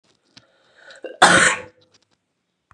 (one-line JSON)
{"cough_length": "2.7 s", "cough_amplitude": 32768, "cough_signal_mean_std_ratio": 0.3, "survey_phase": "beta (2021-08-13 to 2022-03-07)", "age": "45-64", "gender": "Female", "wearing_mask": "No", "symptom_cough_any": true, "symptom_runny_or_blocked_nose": true, "symptom_fatigue": true, "symptom_onset": "3 days", "smoker_status": "Never smoked", "respiratory_condition_asthma": false, "respiratory_condition_other": false, "recruitment_source": "Test and Trace", "submission_delay": "2 days", "covid_test_result": "Positive", "covid_test_method": "RT-qPCR", "covid_ct_value": 22.6, "covid_ct_gene": "ORF1ab gene", "covid_ct_mean": 22.9, "covid_viral_load": "32000 copies/ml", "covid_viral_load_category": "Low viral load (10K-1M copies/ml)"}